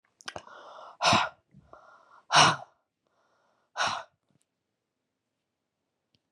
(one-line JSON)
{"exhalation_length": "6.3 s", "exhalation_amplitude": 17583, "exhalation_signal_mean_std_ratio": 0.27, "survey_phase": "beta (2021-08-13 to 2022-03-07)", "age": "45-64", "gender": "Female", "wearing_mask": "No", "symptom_cough_any": true, "symptom_runny_or_blocked_nose": true, "symptom_change_to_sense_of_smell_or_taste": true, "symptom_loss_of_taste": true, "symptom_onset": "6 days", "smoker_status": "Never smoked", "respiratory_condition_asthma": false, "respiratory_condition_other": false, "recruitment_source": "REACT", "submission_delay": "3 days", "covid_test_result": "Negative", "covid_test_method": "RT-qPCR", "influenza_a_test_result": "Negative", "influenza_b_test_result": "Negative"}